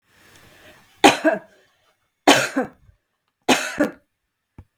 {"three_cough_length": "4.8 s", "three_cough_amplitude": 32766, "three_cough_signal_mean_std_ratio": 0.31, "survey_phase": "beta (2021-08-13 to 2022-03-07)", "age": "45-64", "gender": "Female", "wearing_mask": "No", "symptom_none": true, "smoker_status": "Never smoked", "respiratory_condition_asthma": false, "respiratory_condition_other": false, "recruitment_source": "REACT", "submission_delay": "1 day", "covid_test_result": "Negative", "covid_test_method": "RT-qPCR"}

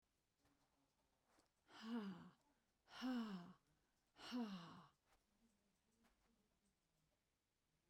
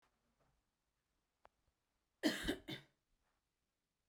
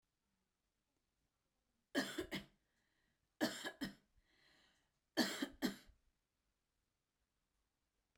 {"exhalation_length": "7.9 s", "exhalation_amplitude": 475, "exhalation_signal_mean_std_ratio": 0.39, "cough_length": "4.1 s", "cough_amplitude": 2105, "cough_signal_mean_std_ratio": 0.23, "three_cough_length": "8.2 s", "three_cough_amplitude": 2654, "three_cough_signal_mean_std_ratio": 0.28, "survey_phase": "beta (2021-08-13 to 2022-03-07)", "age": "45-64", "gender": "Female", "wearing_mask": "No", "symptom_none": true, "smoker_status": "Ex-smoker", "respiratory_condition_asthma": false, "respiratory_condition_other": false, "recruitment_source": "REACT", "submission_delay": "1 day", "covid_test_result": "Negative", "covid_test_method": "RT-qPCR"}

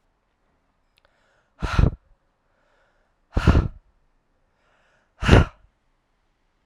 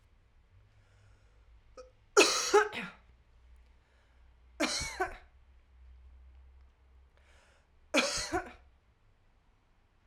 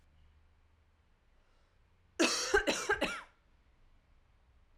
{"exhalation_length": "6.7 s", "exhalation_amplitude": 32767, "exhalation_signal_mean_std_ratio": 0.24, "three_cough_length": "10.1 s", "three_cough_amplitude": 9853, "three_cough_signal_mean_std_ratio": 0.3, "cough_length": "4.8 s", "cough_amplitude": 5952, "cough_signal_mean_std_ratio": 0.34, "survey_phase": "alpha (2021-03-01 to 2021-08-12)", "age": "18-44", "gender": "Female", "wearing_mask": "No", "symptom_cough_any": true, "symptom_abdominal_pain": true, "symptom_fatigue": true, "symptom_headache": true, "smoker_status": "Never smoked", "respiratory_condition_asthma": false, "respiratory_condition_other": false, "recruitment_source": "Test and Trace", "submission_delay": "2 days", "covid_test_result": "Positive", "covid_test_method": "RT-qPCR"}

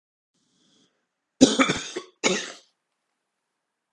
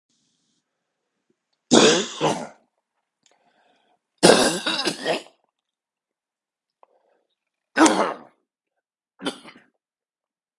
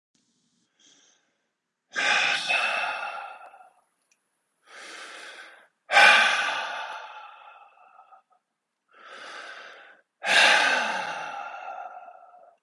{"cough_length": "3.9 s", "cough_amplitude": 32767, "cough_signal_mean_std_ratio": 0.27, "three_cough_length": "10.6 s", "three_cough_amplitude": 32768, "three_cough_signal_mean_std_ratio": 0.29, "exhalation_length": "12.6 s", "exhalation_amplitude": 25696, "exhalation_signal_mean_std_ratio": 0.41, "survey_phase": "beta (2021-08-13 to 2022-03-07)", "age": "45-64", "gender": "Male", "wearing_mask": "No", "symptom_cough_any": true, "symptom_runny_or_blocked_nose": true, "smoker_status": "Never smoked", "respiratory_condition_asthma": false, "respiratory_condition_other": false, "recruitment_source": "Test and Trace", "submission_delay": "1 day", "covid_test_result": "Positive", "covid_test_method": "LFT"}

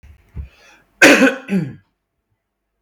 {"cough_length": "2.8 s", "cough_amplitude": 32768, "cough_signal_mean_std_ratio": 0.34, "survey_phase": "beta (2021-08-13 to 2022-03-07)", "age": "18-44", "gender": "Male", "wearing_mask": "No", "symptom_none": true, "smoker_status": "Ex-smoker", "respiratory_condition_asthma": false, "respiratory_condition_other": false, "recruitment_source": "REACT", "submission_delay": "4 days", "covid_test_result": "Negative", "covid_test_method": "RT-qPCR"}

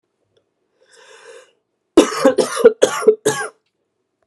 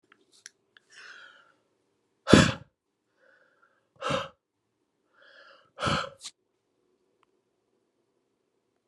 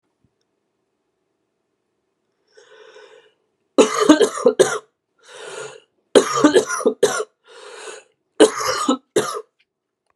{"cough_length": "4.3 s", "cough_amplitude": 32768, "cough_signal_mean_std_ratio": 0.34, "exhalation_length": "8.9 s", "exhalation_amplitude": 32682, "exhalation_signal_mean_std_ratio": 0.19, "three_cough_length": "10.2 s", "three_cough_amplitude": 32768, "three_cough_signal_mean_std_ratio": 0.35, "survey_phase": "beta (2021-08-13 to 2022-03-07)", "age": "18-44", "gender": "Male", "wearing_mask": "No", "symptom_cough_any": true, "symptom_new_continuous_cough": true, "symptom_runny_or_blocked_nose": true, "symptom_fatigue": true, "symptom_fever_high_temperature": true, "symptom_change_to_sense_of_smell_or_taste": true, "symptom_loss_of_taste": true, "symptom_onset": "4 days", "smoker_status": "Ex-smoker", "respiratory_condition_asthma": true, "respiratory_condition_other": false, "recruitment_source": "Test and Trace", "submission_delay": "2 days", "covid_test_result": "Positive", "covid_test_method": "RT-qPCR", "covid_ct_value": 16.4, "covid_ct_gene": "ORF1ab gene", "covid_ct_mean": 16.8, "covid_viral_load": "3100000 copies/ml", "covid_viral_load_category": "High viral load (>1M copies/ml)"}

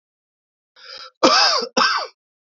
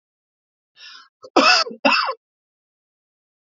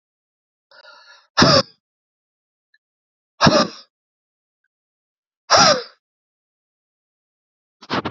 {"three_cough_length": "2.6 s", "three_cough_amplitude": 29409, "three_cough_signal_mean_std_ratio": 0.44, "cough_length": "3.5 s", "cough_amplitude": 27962, "cough_signal_mean_std_ratio": 0.32, "exhalation_length": "8.1 s", "exhalation_amplitude": 32768, "exhalation_signal_mean_std_ratio": 0.27, "survey_phase": "beta (2021-08-13 to 2022-03-07)", "age": "18-44", "gender": "Male", "wearing_mask": "No", "symptom_cough_any": true, "smoker_status": "Never smoked", "respiratory_condition_asthma": false, "respiratory_condition_other": false, "recruitment_source": "Test and Trace", "submission_delay": "2 days", "covid_test_result": "Negative", "covid_test_method": "LFT"}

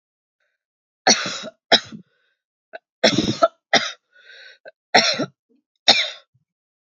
{"cough_length": "6.9 s", "cough_amplitude": 32767, "cough_signal_mean_std_ratio": 0.32, "survey_phase": "beta (2021-08-13 to 2022-03-07)", "age": "18-44", "gender": "Female", "wearing_mask": "No", "symptom_cough_any": true, "symptom_runny_or_blocked_nose": true, "symptom_shortness_of_breath": true, "symptom_headache": true, "symptom_change_to_sense_of_smell_or_taste": true, "symptom_loss_of_taste": true, "symptom_onset": "4 days", "smoker_status": "Ex-smoker", "respiratory_condition_asthma": false, "respiratory_condition_other": false, "recruitment_source": "Test and Trace", "submission_delay": "1 day", "covid_test_result": "Positive", "covid_test_method": "RT-qPCR", "covid_ct_value": 23.2, "covid_ct_gene": "N gene"}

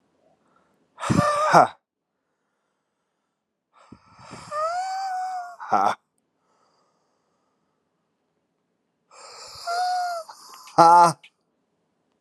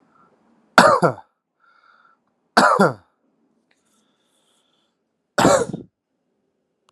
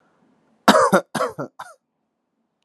{"exhalation_length": "12.2 s", "exhalation_amplitude": 31186, "exhalation_signal_mean_std_ratio": 0.33, "three_cough_length": "6.9 s", "three_cough_amplitude": 32768, "three_cough_signal_mean_std_ratio": 0.28, "cough_length": "2.6 s", "cough_amplitude": 32768, "cough_signal_mean_std_ratio": 0.32, "survey_phase": "alpha (2021-03-01 to 2021-08-12)", "age": "18-44", "gender": "Male", "wearing_mask": "No", "symptom_cough_any": true, "symptom_shortness_of_breath": true, "symptom_diarrhoea": true, "symptom_fatigue": true, "symptom_fever_high_temperature": true, "symptom_headache": true, "symptom_change_to_sense_of_smell_or_taste": true, "symptom_loss_of_taste": true, "symptom_onset": "5 days", "smoker_status": "Prefer not to say", "respiratory_condition_asthma": false, "respiratory_condition_other": false, "recruitment_source": "Test and Trace", "submission_delay": "1 day", "covid_test_result": "Positive", "covid_test_method": "RT-qPCR", "covid_ct_value": 16.4, "covid_ct_gene": "ORF1ab gene", "covid_ct_mean": 16.9, "covid_viral_load": "2800000 copies/ml", "covid_viral_load_category": "High viral load (>1M copies/ml)"}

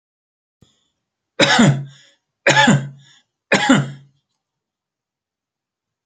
{"three_cough_length": "6.1 s", "three_cough_amplitude": 30062, "three_cough_signal_mean_std_ratio": 0.35, "survey_phase": "alpha (2021-03-01 to 2021-08-12)", "age": "45-64", "gender": "Male", "wearing_mask": "No", "symptom_none": true, "smoker_status": "Never smoked", "respiratory_condition_asthma": true, "respiratory_condition_other": false, "recruitment_source": "REACT", "submission_delay": "2 days", "covid_test_result": "Negative", "covid_test_method": "RT-qPCR"}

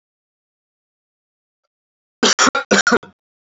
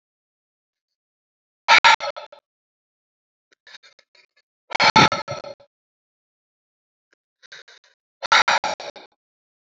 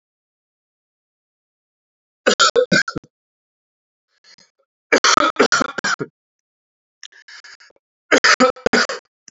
{"cough_length": "3.4 s", "cough_amplitude": 30248, "cough_signal_mean_std_ratio": 0.3, "exhalation_length": "9.6 s", "exhalation_amplitude": 29561, "exhalation_signal_mean_std_ratio": 0.25, "three_cough_length": "9.3 s", "three_cough_amplitude": 31653, "three_cough_signal_mean_std_ratio": 0.33, "survey_phase": "alpha (2021-03-01 to 2021-08-12)", "age": "18-44", "gender": "Male", "wearing_mask": "No", "symptom_fatigue": true, "symptom_headache": true, "symptom_change_to_sense_of_smell_or_taste": true, "symptom_onset": "4 days", "smoker_status": "Never smoked", "respiratory_condition_asthma": true, "respiratory_condition_other": false, "recruitment_source": "Test and Trace", "submission_delay": "2 days", "covid_test_result": "Positive", "covid_test_method": "RT-qPCR", "covid_ct_value": 23.5, "covid_ct_gene": "ORF1ab gene", "covid_ct_mean": 23.5, "covid_viral_load": "19000 copies/ml", "covid_viral_load_category": "Low viral load (10K-1M copies/ml)"}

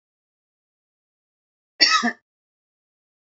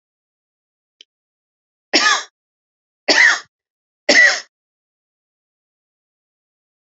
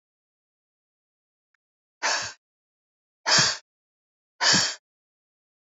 {"cough_length": "3.2 s", "cough_amplitude": 28409, "cough_signal_mean_std_ratio": 0.23, "three_cough_length": "7.0 s", "three_cough_amplitude": 32767, "three_cough_signal_mean_std_ratio": 0.28, "exhalation_length": "5.7 s", "exhalation_amplitude": 18312, "exhalation_signal_mean_std_ratio": 0.3, "survey_phase": "beta (2021-08-13 to 2022-03-07)", "age": "45-64", "gender": "Female", "wearing_mask": "No", "symptom_none": true, "smoker_status": "Never smoked", "respiratory_condition_asthma": false, "respiratory_condition_other": false, "recruitment_source": "REACT", "submission_delay": "1 day", "covid_test_result": "Negative", "covid_test_method": "RT-qPCR", "influenza_a_test_result": "Negative", "influenza_b_test_result": "Negative"}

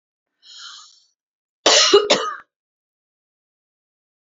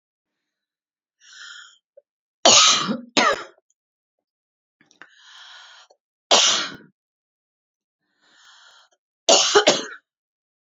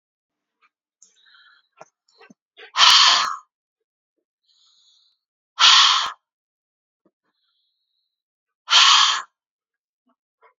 {"cough_length": "4.4 s", "cough_amplitude": 32355, "cough_signal_mean_std_ratio": 0.29, "three_cough_length": "10.7 s", "three_cough_amplitude": 32767, "three_cough_signal_mean_std_ratio": 0.3, "exhalation_length": "10.6 s", "exhalation_amplitude": 32768, "exhalation_signal_mean_std_ratio": 0.3, "survey_phase": "beta (2021-08-13 to 2022-03-07)", "age": "45-64", "gender": "Female", "wearing_mask": "No", "symptom_runny_or_blocked_nose": true, "smoker_status": "Never smoked", "respiratory_condition_asthma": false, "respiratory_condition_other": false, "recruitment_source": "Test and Trace", "submission_delay": "2 days", "covid_test_result": "Positive", "covid_test_method": "RT-qPCR", "covid_ct_value": 31.7, "covid_ct_gene": "ORF1ab gene"}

